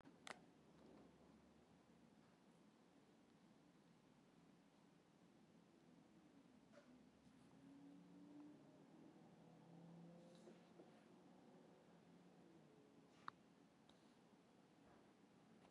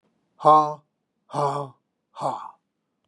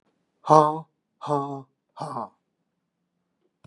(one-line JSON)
{"cough_length": "15.7 s", "cough_amplitude": 575, "cough_signal_mean_std_ratio": 0.93, "exhalation_length": "3.1 s", "exhalation_amplitude": 27419, "exhalation_signal_mean_std_ratio": 0.34, "three_cough_length": "3.7 s", "three_cough_amplitude": 28543, "three_cough_signal_mean_std_ratio": 0.27, "survey_phase": "beta (2021-08-13 to 2022-03-07)", "age": "65+", "gender": "Male", "wearing_mask": "No", "symptom_none": true, "smoker_status": "Ex-smoker", "respiratory_condition_asthma": false, "respiratory_condition_other": false, "recruitment_source": "REACT", "submission_delay": "2 days", "covid_test_result": "Negative", "covid_test_method": "RT-qPCR", "influenza_a_test_result": "Negative", "influenza_b_test_result": "Negative"}